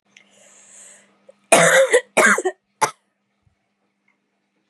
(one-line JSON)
{"three_cough_length": "4.7 s", "three_cough_amplitude": 32768, "three_cough_signal_mean_std_ratio": 0.34, "survey_phase": "beta (2021-08-13 to 2022-03-07)", "age": "18-44", "gender": "Female", "wearing_mask": "No", "symptom_runny_or_blocked_nose": true, "symptom_fatigue": true, "symptom_other": true, "symptom_onset": "3 days", "smoker_status": "Never smoked", "respiratory_condition_asthma": false, "respiratory_condition_other": false, "recruitment_source": "Test and Trace", "submission_delay": "1 day", "covid_test_result": "Positive", "covid_test_method": "RT-qPCR", "covid_ct_value": 18.2, "covid_ct_gene": "ORF1ab gene", "covid_ct_mean": 18.4, "covid_viral_load": "920000 copies/ml", "covid_viral_load_category": "Low viral load (10K-1M copies/ml)"}